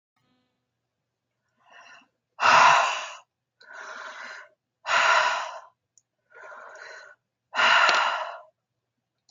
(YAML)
exhalation_length: 9.3 s
exhalation_amplitude: 21849
exhalation_signal_mean_std_ratio: 0.39
survey_phase: beta (2021-08-13 to 2022-03-07)
age: 45-64
gender: Female
wearing_mask: 'No'
symptom_none: true
smoker_status: Never smoked
respiratory_condition_asthma: false
respiratory_condition_other: false
recruitment_source: Test and Trace
submission_delay: 1 day
covid_test_result: Negative
covid_test_method: ePCR